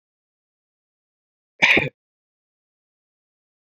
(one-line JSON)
{"cough_length": "3.8 s", "cough_amplitude": 27369, "cough_signal_mean_std_ratio": 0.19, "survey_phase": "beta (2021-08-13 to 2022-03-07)", "age": "45-64", "gender": "Male", "wearing_mask": "No", "symptom_none": true, "smoker_status": "Never smoked", "respiratory_condition_asthma": false, "respiratory_condition_other": false, "recruitment_source": "REACT", "submission_delay": "1 day", "covid_test_result": "Negative", "covid_test_method": "RT-qPCR"}